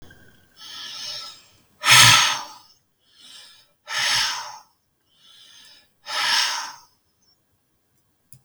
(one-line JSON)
{"exhalation_length": "8.4 s", "exhalation_amplitude": 32768, "exhalation_signal_mean_std_ratio": 0.34, "survey_phase": "beta (2021-08-13 to 2022-03-07)", "age": "65+", "gender": "Male", "wearing_mask": "No", "symptom_none": true, "smoker_status": "Ex-smoker", "respiratory_condition_asthma": false, "respiratory_condition_other": false, "recruitment_source": "REACT", "submission_delay": "3 days", "covid_test_result": "Negative", "covid_test_method": "RT-qPCR", "influenza_a_test_result": "Negative", "influenza_b_test_result": "Negative"}